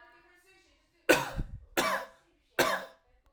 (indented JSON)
{
  "three_cough_length": "3.3 s",
  "three_cough_amplitude": 14924,
  "three_cough_signal_mean_std_ratio": 0.38,
  "survey_phase": "alpha (2021-03-01 to 2021-08-12)",
  "age": "18-44",
  "gender": "Male",
  "wearing_mask": "No",
  "symptom_none": true,
  "smoker_status": "Never smoked",
  "respiratory_condition_asthma": false,
  "respiratory_condition_other": false,
  "recruitment_source": "REACT",
  "submission_delay": "2 days",
  "covid_test_result": "Negative",
  "covid_test_method": "RT-qPCR"
}